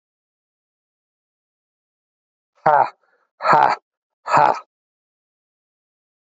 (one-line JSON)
{"exhalation_length": "6.2 s", "exhalation_amplitude": 30536, "exhalation_signal_mean_std_ratio": 0.27, "survey_phase": "alpha (2021-03-01 to 2021-08-12)", "age": "45-64", "gender": "Male", "wearing_mask": "No", "symptom_cough_any": true, "symptom_new_continuous_cough": true, "symptom_fatigue": true, "symptom_onset": "3 days", "smoker_status": "Current smoker (e-cigarettes or vapes only)", "respiratory_condition_asthma": false, "respiratory_condition_other": false, "recruitment_source": "Test and Trace", "submission_delay": "2 days", "covid_test_result": "Positive", "covid_test_method": "RT-qPCR", "covid_ct_value": 16.3, "covid_ct_gene": "N gene", "covid_ct_mean": 16.5, "covid_viral_load": "3800000 copies/ml", "covid_viral_load_category": "High viral load (>1M copies/ml)"}